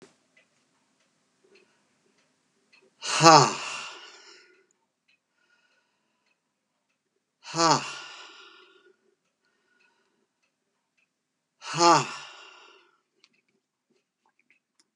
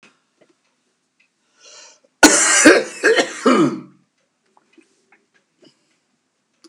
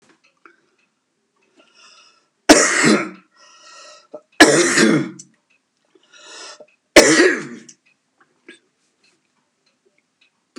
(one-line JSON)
{"exhalation_length": "15.0 s", "exhalation_amplitude": 31965, "exhalation_signal_mean_std_ratio": 0.21, "cough_length": "6.7 s", "cough_amplitude": 32768, "cough_signal_mean_std_ratio": 0.33, "three_cough_length": "10.6 s", "three_cough_amplitude": 32768, "three_cough_signal_mean_std_ratio": 0.31, "survey_phase": "beta (2021-08-13 to 2022-03-07)", "age": "45-64", "gender": "Male", "wearing_mask": "No", "symptom_none": true, "smoker_status": "Never smoked", "respiratory_condition_asthma": false, "respiratory_condition_other": false, "recruitment_source": "REACT", "submission_delay": "3 days", "covid_test_result": "Negative", "covid_test_method": "RT-qPCR", "influenza_a_test_result": "Negative", "influenza_b_test_result": "Negative"}